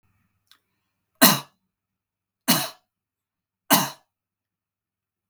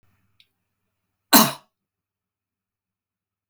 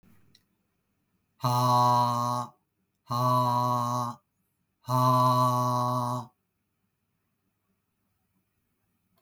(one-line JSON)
{"three_cough_length": "5.3 s", "three_cough_amplitude": 32768, "three_cough_signal_mean_std_ratio": 0.22, "cough_length": "3.5 s", "cough_amplitude": 32766, "cough_signal_mean_std_ratio": 0.17, "exhalation_length": "9.2 s", "exhalation_amplitude": 9477, "exhalation_signal_mean_std_ratio": 0.51, "survey_phase": "beta (2021-08-13 to 2022-03-07)", "age": "45-64", "gender": "Male", "wearing_mask": "No", "symptom_none": true, "smoker_status": "Never smoked", "respiratory_condition_asthma": false, "respiratory_condition_other": false, "recruitment_source": "REACT", "submission_delay": "1 day", "covid_test_result": "Negative", "covid_test_method": "RT-qPCR", "influenza_a_test_result": "Negative", "influenza_b_test_result": "Negative"}